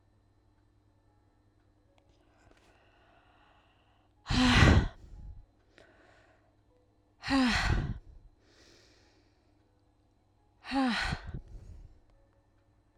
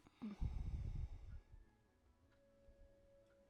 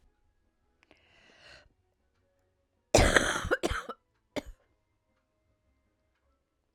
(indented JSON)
{
  "exhalation_length": "13.0 s",
  "exhalation_amplitude": 13235,
  "exhalation_signal_mean_std_ratio": 0.31,
  "cough_length": "3.5 s",
  "cough_amplitude": 743,
  "cough_signal_mean_std_ratio": 0.53,
  "three_cough_length": "6.7 s",
  "three_cough_amplitude": 17493,
  "three_cough_signal_mean_std_ratio": 0.24,
  "survey_phase": "beta (2021-08-13 to 2022-03-07)",
  "age": "45-64",
  "gender": "Female",
  "wearing_mask": "No",
  "symptom_cough_any": true,
  "symptom_runny_or_blocked_nose": true,
  "symptom_shortness_of_breath": true,
  "symptom_sore_throat": true,
  "symptom_fatigue": true,
  "symptom_fever_high_temperature": true,
  "symptom_headache": true,
  "symptom_other": true,
  "symptom_onset": "2 days",
  "smoker_status": "Never smoked",
  "respiratory_condition_asthma": false,
  "respiratory_condition_other": false,
  "recruitment_source": "Test and Trace",
  "submission_delay": "2 days",
  "covid_test_result": "Positive",
  "covid_test_method": "RT-qPCR",
  "covid_ct_value": 23.0,
  "covid_ct_gene": "ORF1ab gene",
  "covid_ct_mean": 23.7,
  "covid_viral_load": "17000 copies/ml",
  "covid_viral_load_category": "Low viral load (10K-1M copies/ml)"
}